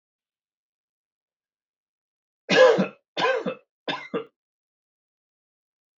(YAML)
three_cough_length: 6.0 s
three_cough_amplitude: 21388
three_cough_signal_mean_std_ratio: 0.27
survey_phase: beta (2021-08-13 to 2022-03-07)
age: 45-64
gender: Male
wearing_mask: 'No'
symptom_cough_any: true
symptom_runny_or_blocked_nose: true
symptom_sore_throat: true
symptom_diarrhoea: true
symptom_headache: true
symptom_onset: 3 days
smoker_status: Ex-smoker
respiratory_condition_asthma: false
respiratory_condition_other: false
recruitment_source: Test and Trace
submission_delay: 2 days
covid_test_result: Positive
covid_test_method: RT-qPCR
covid_ct_value: 25.2
covid_ct_gene: ORF1ab gene
covid_ct_mean: 25.8
covid_viral_load: 3400 copies/ml
covid_viral_load_category: Minimal viral load (< 10K copies/ml)